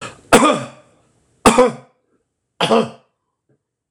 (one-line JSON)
{"three_cough_length": "3.9 s", "three_cough_amplitude": 26028, "three_cough_signal_mean_std_ratio": 0.36, "survey_phase": "beta (2021-08-13 to 2022-03-07)", "age": "65+", "gender": "Male", "wearing_mask": "No", "symptom_none": true, "smoker_status": "Never smoked", "respiratory_condition_asthma": false, "respiratory_condition_other": false, "recruitment_source": "REACT", "submission_delay": "2 days", "covid_test_result": "Negative", "covid_test_method": "RT-qPCR", "influenza_a_test_result": "Negative", "influenza_b_test_result": "Negative"}